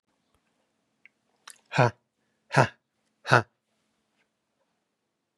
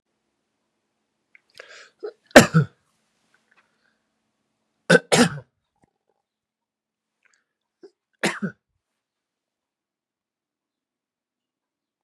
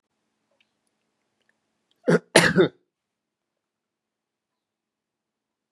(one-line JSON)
{"exhalation_length": "5.4 s", "exhalation_amplitude": 28273, "exhalation_signal_mean_std_ratio": 0.19, "three_cough_length": "12.0 s", "three_cough_amplitude": 32768, "three_cough_signal_mean_std_ratio": 0.16, "cough_length": "5.7 s", "cough_amplitude": 32527, "cough_signal_mean_std_ratio": 0.2, "survey_phase": "beta (2021-08-13 to 2022-03-07)", "age": "45-64", "gender": "Male", "wearing_mask": "No", "symptom_none": true, "smoker_status": "Ex-smoker", "respiratory_condition_asthma": false, "respiratory_condition_other": false, "recruitment_source": "REACT", "submission_delay": "3 days", "covid_test_result": "Negative", "covid_test_method": "RT-qPCR", "influenza_a_test_result": "Negative", "influenza_b_test_result": "Negative"}